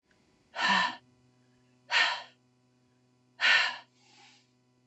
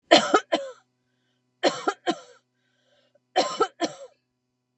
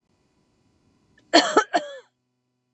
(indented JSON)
{
  "exhalation_length": "4.9 s",
  "exhalation_amplitude": 9260,
  "exhalation_signal_mean_std_ratio": 0.37,
  "three_cough_length": "4.8 s",
  "three_cough_amplitude": 32282,
  "three_cough_signal_mean_std_ratio": 0.32,
  "cough_length": "2.7 s",
  "cough_amplitude": 26748,
  "cough_signal_mean_std_ratio": 0.27,
  "survey_phase": "beta (2021-08-13 to 2022-03-07)",
  "age": "18-44",
  "gender": "Female",
  "wearing_mask": "No",
  "symptom_none": true,
  "symptom_onset": "10 days",
  "smoker_status": "Ex-smoker",
  "respiratory_condition_asthma": false,
  "respiratory_condition_other": false,
  "recruitment_source": "REACT",
  "submission_delay": "1 day",
  "covid_test_result": "Negative",
  "covid_test_method": "RT-qPCR",
  "covid_ct_value": 40.0,
  "covid_ct_gene": "N gene",
  "influenza_a_test_result": "Unknown/Void",
  "influenza_b_test_result": "Unknown/Void"
}